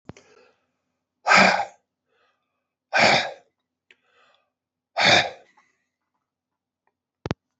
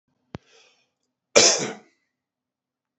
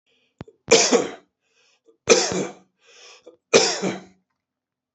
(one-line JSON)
{"exhalation_length": "7.6 s", "exhalation_amplitude": 24775, "exhalation_signal_mean_std_ratio": 0.29, "cough_length": "3.0 s", "cough_amplitude": 28427, "cough_signal_mean_std_ratio": 0.24, "three_cough_length": "4.9 s", "three_cough_amplitude": 30950, "three_cough_signal_mean_std_ratio": 0.35, "survey_phase": "alpha (2021-03-01 to 2021-08-12)", "age": "45-64", "gender": "Male", "wearing_mask": "No", "symptom_fatigue": true, "symptom_headache": true, "smoker_status": "Ex-smoker", "respiratory_condition_asthma": false, "respiratory_condition_other": false, "recruitment_source": "Test and Trace", "submission_delay": "1 day", "covid_test_result": "Positive", "covid_test_method": "RT-qPCR", "covid_ct_value": 19.2, "covid_ct_gene": "ORF1ab gene", "covid_ct_mean": 19.8, "covid_viral_load": "330000 copies/ml", "covid_viral_load_category": "Low viral load (10K-1M copies/ml)"}